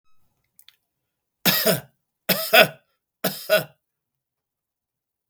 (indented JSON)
{
  "three_cough_length": "5.3 s",
  "three_cough_amplitude": 32768,
  "three_cough_signal_mean_std_ratio": 0.29,
  "survey_phase": "beta (2021-08-13 to 2022-03-07)",
  "age": "45-64",
  "gender": "Male",
  "wearing_mask": "No",
  "symptom_none": true,
  "smoker_status": "Never smoked",
  "respiratory_condition_asthma": false,
  "respiratory_condition_other": false,
  "recruitment_source": "REACT",
  "submission_delay": "3 days",
  "covid_test_result": "Negative",
  "covid_test_method": "RT-qPCR"
}